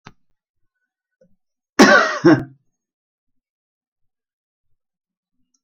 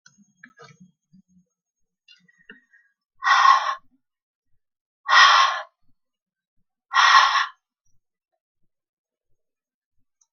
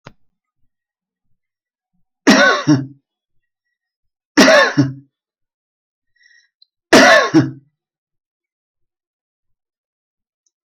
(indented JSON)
{
  "cough_length": "5.6 s",
  "cough_amplitude": 31116,
  "cough_signal_mean_std_ratio": 0.24,
  "exhalation_length": "10.3 s",
  "exhalation_amplitude": 27258,
  "exhalation_signal_mean_std_ratio": 0.3,
  "three_cough_length": "10.7 s",
  "three_cough_amplitude": 32767,
  "three_cough_signal_mean_std_ratio": 0.3,
  "survey_phase": "alpha (2021-03-01 to 2021-08-12)",
  "age": "45-64",
  "gender": "Female",
  "wearing_mask": "No",
  "symptom_none": true,
  "smoker_status": "Never smoked",
  "respiratory_condition_asthma": false,
  "respiratory_condition_other": false,
  "recruitment_source": "REACT",
  "submission_delay": "6 days",
  "covid_test_result": "Negative",
  "covid_test_method": "RT-qPCR"
}